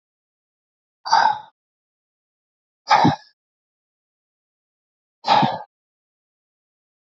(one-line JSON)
{"exhalation_length": "7.1 s", "exhalation_amplitude": 27337, "exhalation_signal_mean_std_ratio": 0.27, "survey_phase": "alpha (2021-03-01 to 2021-08-12)", "age": "45-64", "gender": "Male", "wearing_mask": "No", "symptom_cough_any": true, "symptom_fatigue": true, "symptom_onset": "8 days", "smoker_status": "Ex-smoker", "respiratory_condition_asthma": false, "respiratory_condition_other": false, "recruitment_source": "REACT", "submission_delay": "1 day", "covid_test_result": "Negative", "covid_test_method": "RT-qPCR"}